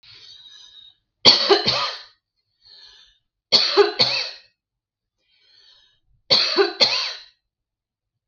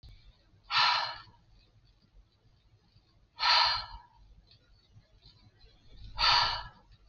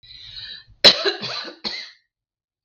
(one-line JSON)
{"three_cough_length": "8.3 s", "three_cough_amplitude": 32768, "three_cough_signal_mean_std_ratio": 0.38, "exhalation_length": "7.1 s", "exhalation_amplitude": 8474, "exhalation_signal_mean_std_ratio": 0.37, "cough_length": "2.6 s", "cough_amplitude": 32768, "cough_signal_mean_std_ratio": 0.31, "survey_phase": "beta (2021-08-13 to 2022-03-07)", "age": "45-64", "gender": "Female", "wearing_mask": "No", "symptom_none": true, "smoker_status": "Never smoked", "respiratory_condition_asthma": false, "respiratory_condition_other": false, "recruitment_source": "REACT", "submission_delay": "11 days", "covid_test_result": "Negative", "covid_test_method": "RT-qPCR", "influenza_a_test_result": "Unknown/Void", "influenza_b_test_result": "Unknown/Void"}